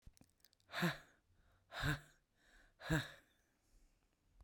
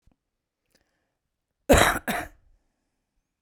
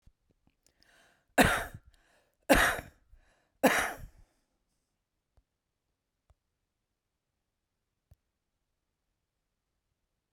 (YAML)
exhalation_length: 4.4 s
exhalation_amplitude: 2110
exhalation_signal_mean_std_ratio: 0.33
cough_length: 3.4 s
cough_amplitude: 22358
cough_signal_mean_std_ratio: 0.25
three_cough_length: 10.3 s
three_cough_amplitude: 13602
three_cough_signal_mean_std_ratio: 0.21
survey_phase: beta (2021-08-13 to 2022-03-07)
age: 45-64
gender: Female
wearing_mask: 'No'
symptom_none: true
symptom_onset: 4 days
smoker_status: Current smoker (11 or more cigarettes per day)
respiratory_condition_asthma: true
respiratory_condition_other: true
recruitment_source: REACT
submission_delay: 2 days
covid_test_result: Negative
covid_test_method: RT-qPCR